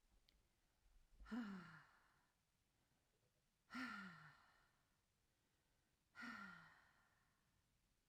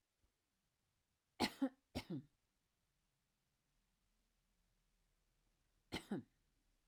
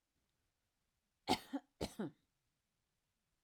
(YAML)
exhalation_length: 8.1 s
exhalation_amplitude: 350
exhalation_signal_mean_std_ratio: 0.41
three_cough_length: 6.9 s
three_cough_amplitude: 1877
three_cough_signal_mean_std_ratio: 0.22
cough_length: 3.4 s
cough_amplitude: 3743
cough_signal_mean_std_ratio: 0.23
survey_phase: alpha (2021-03-01 to 2021-08-12)
age: 65+
gender: Female
wearing_mask: 'No'
symptom_none: true
smoker_status: Never smoked
respiratory_condition_asthma: false
respiratory_condition_other: false
recruitment_source: REACT
submission_delay: 2 days
covid_test_result: Negative
covid_test_method: RT-qPCR